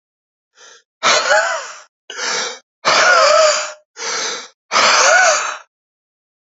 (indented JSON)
{
  "exhalation_length": "6.6 s",
  "exhalation_amplitude": 32768,
  "exhalation_signal_mean_std_ratio": 0.57,
  "survey_phase": "beta (2021-08-13 to 2022-03-07)",
  "age": "45-64",
  "gender": "Male",
  "wearing_mask": "No",
  "symptom_cough_any": true,
  "symptom_runny_or_blocked_nose": true,
  "symptom_sore_throat": true,
  "symptom_fatigue": true,
  "symptom_fever_high_temperature": true,
  "symptom_headache": true,
  "smoker_status": "Ex-smoker",
  "respiratory_condition_asthma": true,
  "respiratory_condition_other": false,
  "recruitment_source": "Test and Trace",
  "submission_delay": "1 day",
  "covid_test_result": "Positive",
  "covid_test_method": "LFT"
}